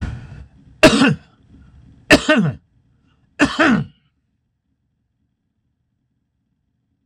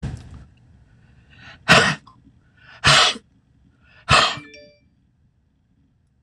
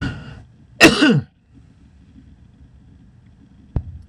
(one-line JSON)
{"three_cough_length": "7.1 s", "three_cough_amplitude": 26028, "three_cough_signal_mean_std_ratio": 0.32, "exhalation_length": "6.2 s", "exhalation_amplitude": 26028, "exhalation_signal_mean_std_ratio": 0.31, "cough_length": "4.1 s", "cough_amplitude": 26028, "cough_signal_mean_std_ratio": 0.31, "survey_phase": "beta (2021-08-13 to 2022-03-07)", "age": "65+", "gender": "Male", "wearing_mask": "No", "symptom_none": true, "smoker_status": "Never smoked", "respiratory_condition_asthma": false, "respiratory_condition_other": false, "recruitment_source": "REACT", "submission_delay": "3 days", "covid_test_result": "Negative", "covid_test_method": "RT-qPCR", "influenza_a_test_result": "Negative", "influenza_b_test_result": "Negative"}